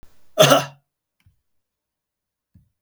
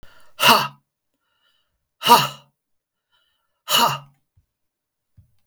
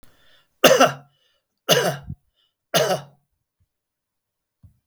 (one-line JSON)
{"cough_length": "2.8 s", "cough_amplitude": 32768, "cough_signal_mean_std_ratio": 0.24, "exhalation_length": "5.5 s", "exhalation_amplitude": 32767, "exhalation_signal_mean_std_ratio": 0.28, "three_cough_length": "4.9 s", "three_cough_amplitude": 32768, "three_cough_signal_mean_std_ratio": 0.31, "survey_phase": "beta (2021-08-13 to 2022-03-07)", "age": "65+", "gender": "Male", "wearing_mask": "No", "symptom_none": true, "smoker_status": "Ex-smoker", "respiratory_condition_asthma": false, "respiratory_condition_other": false, "recruitment_source": "REACT", "submission_delay": "4 days", "covid_test_result": "Negative", "covid_test_method": "RT-qPCR", "influenza_a_test_result": "Negative", "influenza_b_test_result": "Negative"}